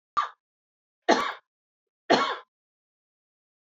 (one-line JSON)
{"three_cough_length": "3.8 s", "three_cough_amplitude": 18406, "three_cough_signal_mean_std_ratio": 0.28, "survey_phase": "alpha (2021-03-01 to 2021-08-12)", "age": "45-64", "gender": "Female", "wearing_mask": "No", "symptom_fatigue": true, "symptom_change_to_sense_of_smell_or_taste": true, "symptom_onset": "6 days", "smoker_status": "Never smoked", "respiratory_condition_asthma": false, "respiratory_condition_other": false, "recruitment_source": "Test and Trace", "submission_delay": "2 days", "covid_test_result": "Positive", "covid_test_method": "ePCR"}